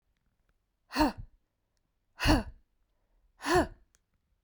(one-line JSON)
{"exhalation_length": "4.4 s", "exhalation_amplitude": 9684, "exhalation_signal_mean_std_ratio": 0.3, "survey_phase": "beta (2021-08-13 to 2022-03-07)", "age": "18-44", "gender": "Female", "wearing_mask": "No", "symptom_none": true, "smoker_status": "Ex-smoker", "respiratory_condition_asthma": false, "respiratory_condition_other": false, "recruitment_source": "REACT", "submission_delay": "6 days", "covid_test_result": "Negative", "covid_test_method": "RT-qPCR"}